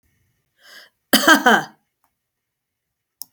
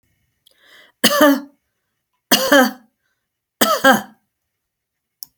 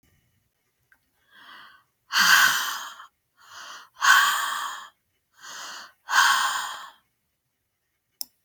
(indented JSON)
{
  "cough_length": "3.3 s",
  "cough_amplitude": 32768,
  "cough_signal_mean_std_ratio": 0.27,
  "three_cough_length": "5.4 s",
  "three_cough_amplitude": 32768,
  "three_cough_signal_mean_std_ratio": 0.35,
  "exhalation_length": "8.4 s",
  "exhalation_amplitude": 21122,
  "exhalation_signal_mean_std_ratio": 0.39,
  "survey_phase": "beta (2021-08-13 to 2022-03-07)",
  "age": "65+",
  "gender": "Female",
  "wearing_mask": "No",
  "symptom_runny_or_blocked_nose": true,
  "symptom_onset": "12 days",
  "smoker_status": "Never smoked",
  "respiratory_condition_asthma": false,
  "respiratory_condition_other": false,
  "recruitment_source": "REACT",
  "submission_delay": "1 day",
  "covid_test_result": "Negative",
  "covid_test_method": "RT-qPCR"
}